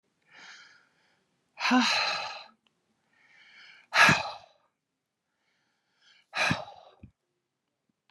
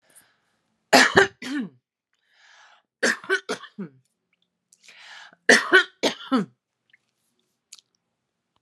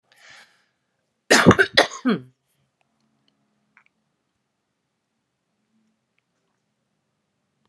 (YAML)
exhalation_length: 8.1 s
exhalation_amplitude: 16102
exhalation_signal_mean_std_ratio: 0.31
three_cough_length: 8.6 s
three_cough_amplitude: 31239
three_cough_signal_mean_std_ratio: 0.28
cough_length: 7.7 s
cough_amplitude: 32767
cough_signal_mean_std_ratio: 0.19
survey_phase: alpha (2021-03-01 to 2021-08-12)
age: 45-64
gender: Female
wearing_mask: 'No'
symptom_none: true
smoker_status: Current smoker (1 to 10 cigarettes per day)
respiratory_condition_asthma: false
respiratory_condition_other: false
recruitment_source: REACT
submission_delay: 1 day
covid_test_result: Negative
covid_test_method: RT-qPCR
covid_ct_value: 46.0
covid_ct_gene: N gene